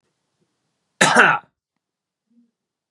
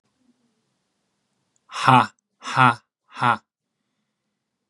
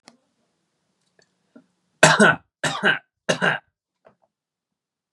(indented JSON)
{
  "cough_length": "2.9 s",
  "cough_amplitude": 32767,
  "cough_signal_mean_std_ratio": 0.27,
  "exhalation_length": "4.7 s",
  "exhalation_amplitude": 29455,
  "exhalation_signal_mean_std_ratio": 0.26,
  "three_cough_length": "5.1 s",
  "three_cough_amplitude": 32768,
  "three_cough_signal_mean_std_ratio": 0.29,
  "survey_phase": "beta (2021-08-13 to 2022-03-07)",
  "age": "18-44",
  "gender": "Male",
  "wearing_mask": "No",
  "symptom_none": true,
  "symptom_onset": "5 days",
  "smoker_status": "Never smoked",
  "respiratory_condition_asthma": false,
  "respiratory_condition_other": false,
  "recruitment_source": "REACT",
  "submission_delay": "1 day",
  "covid_test_result": "Negative",
  "covid_test_method": "RT-qPCR",
  "influenza_a_test_result": "Negative",
  "influenza_b_test_result": "Negative"
}